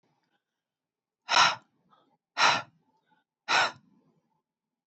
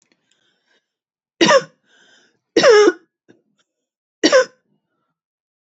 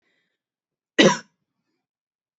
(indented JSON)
{
  "exhalation_length": "4.9 s",
  "exhalation_amplitude": 15681,
  "exhalation_signal_mean_std_ratio": 0.29,
  "three_cough_length": "5.6 s",
  "three_cough_amplitude": 30138,
  "three_cough_signal_mean_std_ratio": 0.3,
  "cough_length": "2.4 s",
  "cough_amplitude": 26291,
  "cough_signal_mean_std_ratio": 0.2,
  "survey_phase": "beta (2021-08-13 to 2022-03-07)",
  "age": "18-44",
  "gender": "Female",
  "wearing_mask": "No",
  "symptom_cough_any": true,
  "symptom_onset": "4 days",
  "smoker_status": "Never smoked",
  "respiratory_condition_asthma": true,
  "respiratory_condition_other": false,
  "recruitment_source": "Test and Trace",
  "submission_delay": "2 days",
  "covid_test_result": "Positive",
  "covid_test_method": "RT-qPCR",
  "covid_ct_value": 27.9,
  "covid_ct_gene": "ORF1ab gene",
  "covid_ct_mean": 28.2,
  "covid_viral_load": "570 copies/ml",
  "covid_viral_load_category": "Minimal viral load (< 10K copies/ml)"
}